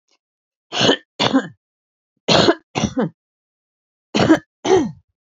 three_cough_length: 5.2 s
three_cough_amplitude: 32767
three_cough_signal_mean_std_ratio: 0.42
survey_phase: beta (2021-08-13 to 2022-03-07)
age: 65+
gender: Female
wearing_mask: 'No'
symptom_cough_any: true
symptom_sore_throat: true
symptom_fever_high_temperature: true
symptom_headache: true
symptom_onset: 5 days
smoker_status: Never smoked
respiratory_condition_asthma: false
respiratory_condition_other: false
recruitment_source: Test and Trace
submission_delay: 2 days
covid_test_result: Positive
covid_test_method: RT-qPCR
covid_ct_value: 30.7
covid_ct_gene: ORF1ab gene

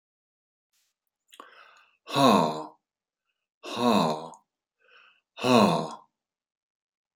exhalation_length: 7.2 s
exhalation_amplitude: 15897
exhalation_signal_mean_std_ratio: 0.35
survey_phase: beta (2021-08-13 to 2022-03-07)
age: 65+
gender: Male
wearing_mask: 'No'
symptom_none: true
smoker_status: Ex-smoker
respiratory_condition_asthma: false
respiratory_condition_other: false
recruitment_source: REACT
submission_delay: 1 day
covid_test_result: Negative
covid_test_method: RT-qPCR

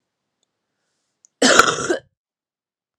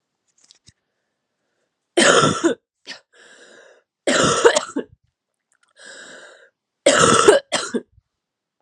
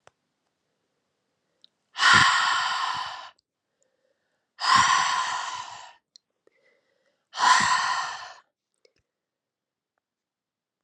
cough_length: 3.0 s
cough_amplitude: 32768
cough_signal_mean_std_ratio: 0.29
three_cough_length: 8.6 s
three_cough_amplitude: 32768
three_cough_signal_mean_std_ratio: 0.37
exhalation_length: 10.8 s
exhalation_amplitude: 24157
exhalation_signal_mean_std_ratio: 0.4
survey_phase: alpha (2021-03-01 to 2021-08-12)
age: 18-44
gender: Female
wearing_mask: 'No'
symptom_cough_any: true
symptom_abdominal_pain: true
symptom_diarrhoea: true
symptom_fatigue: true
symptom_fever_high_temperature: true
symptom_headache: true
symptom_onset: 3 days
smoker_status: Never smoked
respiratory_condition_asthma: false
respiratory_condition_other: false
recruitment_source: Test and Trace
submission_delay: 2 days
covid_test_result: Positive
covid_test_method: RT-qPCR
covid_ct_value: 18.9
covid_ct_gene: ORF1ab gene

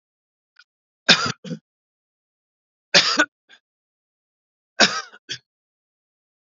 three_cough_length: 6.6 s
three_cough_amplitude: 30982
three_cough_signal_mean_std_ratio: 0.24
survey_phase: beta (2021-08-13 to 2022-03-07)
age: 65+
gender: Male
wearing_mask: 'No'
symptom_none: true
smoker_status: Never smoked
respiratory_condition_asthma: false
respiratory_condition_other: false
recruitment_source: REACT
submission_delay: 2 days
covid_test_result: Negative
covid_test_method: RT-qPCR
influenza_a_test_result: Negative
influenza_b_test_result: Negative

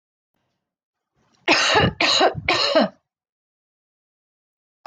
three_cough_length: 4.9 s
three_cough_amplitude: 26859
three_cough_signal_mean_std_ratio: 0.41
survey_phase: beta (2021-08-13 to 2022-03-07)
age: 45-64
gender: Female
wearing_mask: 'No'
symptom_sore_throat: true
smoker_status: Never smoked
respiratory_condition_asthma: false
respiratory_condition_other: false
recruitment_source: REACT
submission_delay: 3 days
covid_test_result: Negative
covid_test_method: RT-qPCR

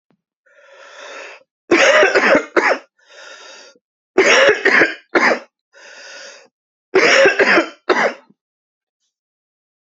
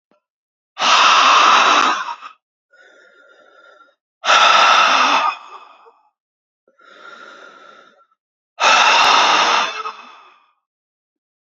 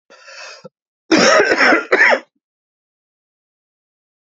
three_cough_length: 9.9 s
three_cough_amplitude: 31680
three_cough_signal_mean_std_ratio: 0.46
exhalation_length: 11.4 s
exhalation_amplitude: 32628
exhalation_signal_mean_std_ratio: 0.5
cough_length: 4.3 s
cough_amplitude: 30830
cough_signal_mean_std_ratio: 0.41
survey_phase: beta (2021-08-13 to 2022-03-07)
age: 18-44
gender: Male
wearing_mask: 'No'
symptom_cough_any: true
symptom_runny_or_blocked_nose: true
symptom_sore_throat: true
smoker_status: Never smoked
respiratory_condition_asthma: false
respiratory_condition_other: false
recruitment_source: Test and Trace
submission_delay: 2 days
covid_test_result: Positive
covid_test_method: RT-qPCR
covid_ct_value: 13.9
covid_ct_gene: ORF1ab gene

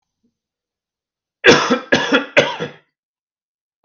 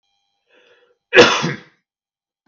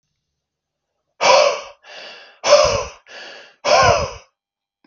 three_cough_length: 3.8 s
three_cough_amplitude: 32768
three_cough_signal_mean_std_ratio: 0.35
cough_length: 2.5 s
cough_amplitude: 32768
cough_signal_mean_std_ratio: 0.27
exhalation_length: 4.9 s
exhalation_amplitude: 32768
exhalation_signal_mean_std_ratio: 0.42
survey_phase: beta (2021-08-13 to 2022-03-07)
age: 45-64
gender: Male
wearing_mask: 'No'
symptom_none: true
smoker_status: Never smoked
respiratory_condition_asthma: false
respiratory_condition_other: false
recruitment_source: REACT
submission_delay: 3 days
covid_test_result: Negative
covid_test_method: RT-qPCR
influenza_a_test_result: Negative
influenza_b_test_result: Negative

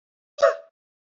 exhalation_length: 1.2 s
exhalation_amplitude: 18823
exhalation_signal_mean_std_ratio: 0.25
survey_phase: beta (2021-08-13 to 2022-03-07)
age: 45-64
gender: Female
wearing_mask: 'No'
symptom_new_continuous_cough: true
symptom_sore_throat: true
symptom_fatigue: true
symptom_fever_high_temperature: true
symptom_onset: 2 days
smoker_status: Ex-smoker
respiratory_condition_asthma: false
respiratory_condition_other: false
recruitment_source: Test and Trace
submission_delay: 1 day
covid_test_result: Positive
covid_test_method: RT-qPCR
covid_ct_value: 27.3
covid_ct_gene: ORF1ab gene
covid_ct_mean: 27.3
covid_viral_load: 1100 copies/ml
covid_viral_load_category: Minimal viral load (< 10K copies/ml)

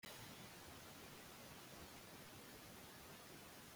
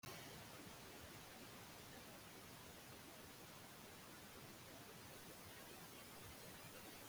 cough_length: 3.8 s
cough_amplitude: 223
cough_signal_mean_std_ratio: 1.25
three_cough_length: 7.1 s
three_cough_amplitude: 300
three_cough_signal_mean_std_ratio: 1.26
survey_phase: beta (2021-08-13 to 2022-03-07)
age: 45-64
gender: Female
wearing_mask: 'No'
symptom_none: true
smoker_status: Current smoker (e-cigarettes or vapes only)
respiratory_condition_asthma: false
respiratory_condition_other: false
recruitment_source: REACT
submission_delay: 1 day
covid_test_result: Negative
covid_test_method: RT-qPCR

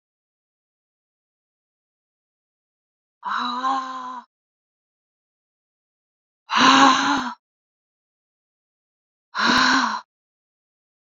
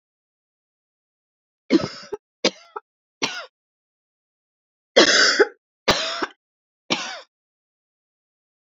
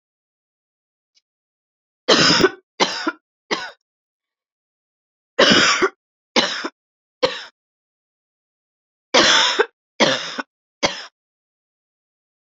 exhalation_length: 11.2 s
exhalation_amplitude: 28737
exhalation_signal_mean_std_ratio: 0.33
cough_length: 8.6 s
cough_amplitude: 30442
cough_signal_mean_std_ratio: 0.28
three_cough_length: 12.5 s
three_cough_amplitude: 30248
three_cough_signal_mean_std_ratio: 0.34
survey_phase: beta (2021-08-13 to 2022-03-07)
age: 18-44
gender: Female
wearing_mask: 'No'
symptom_new_continuous_cough: true
symptom_sore_throat: true
symptom_fatigue: true
symptom_headache: true
symptom_change_to_sense_of_smell_or_taste: true
smoker_status: Never smoked
respiratory_condition_asthma: false
respiratory_condition_other: false
recruitment_source: Test and Trace
submission_delay: 2 days
covid_test_result: Positive
covid_test_method: RT-qPCR
covid_ct_value: 22.9
covid_ct_gene: ORF1ab gene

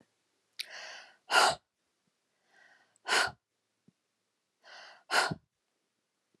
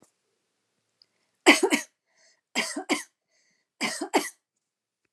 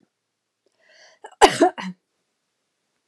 exhalation_length: 6.4 s
exhalation_amplitude: 10073
exhalation_signal_mean_std_ratio: 0.27
three_cough_length: 5.1 s
three_cough_amplitude: 28110
three_cough_signal_mean_std_ratio: 0.28
cough_length: 3.1 s
cough_amplitude: 29204
cough_signal_mean_std_ratio: 0.22
survey_phase: beta (2021-08-13 to 2022-03-07)
age: 45-64
gender: Female
wearing_mask: 'No'
symptom_none: true
smoker_status: Never smoked
respiratory_condition_asthma: false
respiratory_condition_other: false
recruitment_source: REACT
submission_delay: 3 days
covid_test_result: Negative
covid_test_method: RT-qPCR
influenza_a_test_result: Negative
influenza_b_test_result: Negative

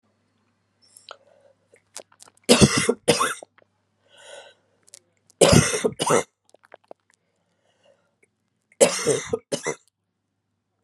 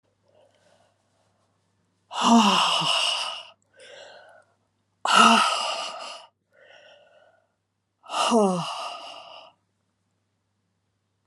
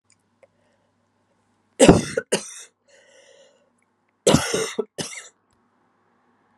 three_cough_length: 10.8 s
three_cough_amplitude: 32068
three_cough_signal_mean_std_ratio: 0.3
exhalation_length: 11.3 s
exhalation_amplitude: 23563
exhalation_signal_mean_std_ratio: 0.39
cough_length: 6.6 s
cough_amplitude: 32767
cough_signal_mean_std_ratio: 0.25
survey_phase: alpha (2021-03-01 to 2021-08-12)
age: 45-64
gender: Female
wearing_mask: 'No'
symptom_cough_any: true
symptom_shortness_of_breath: true
symptom_diarrhoea: true
symptom_fatigue: true
symptom_fever_high_temperature: true
symptom_headache: true
symptom_change_to_sense_of_smell_or_taste: true
symptom_onset: 4 days
smoker_status: Never smoked
respiratory_condition_asthma: false
respiratory_condition_other: false
recruitment_source: Test and Trace
submission_delay: 2 days
covid_test_result: Positive
covid_test_method: RT-qPCR
covid_ct_value: 18.7
covid_ct_gene: ORF1ab gene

